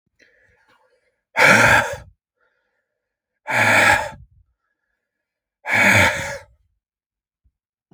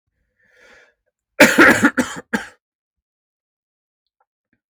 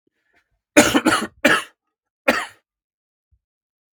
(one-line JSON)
{"exhalation_length": "7.9 s", "exhalation_amplitude": 32768, "exhalation_signal_mean_std_ratio": 0.38, "cough_length": "4.7 s", "cough_amplitude": 32768, "cough_signal_mean_std_ratio": 0.28, "three_cough_length": "3.9 s", "three_cough_amplitude": 32768, "three_cough_signal_mean_std_ratio": 0.32, "survey_phase": "beta (2021-08-13 to 2022-03-07)", "age": "18-44", "gender": "Male", "wearing_mask": "No", "symptom_cough_any": true, "symptom_runny_or_blocked_nose": true, "symptom_shortness_of_breath": true, "symptom_sore_throat": true, "symptom_diarrhoea": true, "symptom_fatigue": true, "symptom_fever_high_temperature": true, "symptom_headache": true, "symptom_change_to_sense_of_smell_or_taste": true, "symptom_onset": "5 days", "smoker_status": "Never smoked", "respiratory_condition_asthma": false, "respiratory_condition_other": false, "recruitment_source": "Test and Trace", "submission_delay": "2 days", "covid_test_result": "Positive", "covid_test_method": "RT-qPCR", "covid_ct_value": 12.6, "covid_ct_gene": "ORF1ab gene", "covid_ct_mean": 13.1, "covid_viral_load": "49000000 copies/ml", "covid_viral_load_category": "High viral load (>1M copies/ml)"}